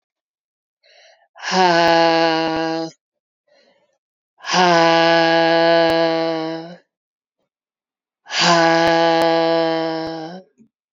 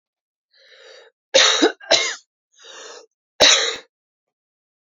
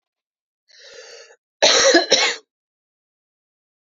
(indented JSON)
{
  "exhalation_length": "10.9 s",
  "exhalation_amplitude": 32043,
  "exhalation_signal_mean_std_ratio": 0.58,
  "three_cough_length": "4.9 s",
  "three_cough_amplitude": 32473,
  "three_cough_signal_mean_std_ratio": 0.35,
  "cough_length": "3.8 s",
  "cough_amplitude": 32768,
  "cough_signal_mean_std_ratio": 0.34,
  "survey_phase": "beta (2021-08-13 to 2022-03-07)",
  "age": "45-64",
  "gender": "Female",
  "wearing_mask": "No",
  "symptom_runny_or_blocked_nose": true,
  "symptom_sore_throat": true,
  "symptom_headache": true,
  "symptom_other": true,
  "symptom_onset": "4 days",
  "smoker_status": "Ex-smoker",
  "respiratory_condition_asthma": false,
  "respiratory_condition_other": false,
  "recruitment_source": "Test and Trace",
  "submission_delay": "1 day",
  "covid_test_result": "Positive",
  "covid_test_method": "RT-qPCR"
}